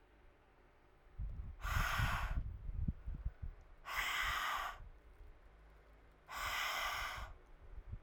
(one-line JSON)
{"exhalation_length": "8.0 s", "exhalation_amplitude": 2480, "exhalation_signal_mean_std_ratio": 0.69, "survey_phase": "alpha (2021-03-01 to 2021-08-12)", "age": "18-44", "gender": "Female", "wearing_mask": "No", "symptom_cough_any": true, "symptom_change_to_sense_of_smell_or_taste": true, "symptom_loss_of_taste": true, "symptom_onset": "8 days", "smoker_status": "Never smoked", "respiratory_condition_asthma": false, "respiratory_condition_other": false, "recruitment_source": "Test and Trace", "submission_delay": "3 days", "covid_test_result": "Positive", "covid_test_method": "RT-qPCR", "covid_ct_value": 18.1, "covid_ct_gene": "ORF1ab gene", "covid_ct_mean": 19.2, "covid_viral_load": "510000 copies/ml", "covid_viral_load_category": "Low viral load (10K-1M copies/ml)"}